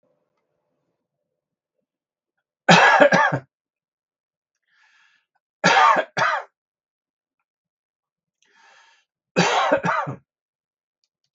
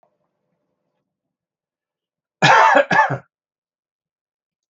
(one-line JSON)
{"three_cough_length": "11.3 s", "three_cough_amplitude": 32768, "three_cough_signal_mean_std_ratio": 0.32, "cough_length": "4.7 s", "cough_amplitude": 32768, "cough_signal_mean_std_ratio": 0.3, "survey_phase": "beta (2021-08-13 to 2022-03-07)", "age": "45-64", "gender": "Male", "wearing_mask": "No", "symptom_none": true, "symptom_onset": "12 days", "smoker_status": "Never smoked", "respiratory_condition_asthma": false, "respiratory_condition_other": true, "recruitment_source": "REACT", "submission_delay": "1 day", "covid_test_result": "Negative", "covid_test_method": "RT-qPCR"}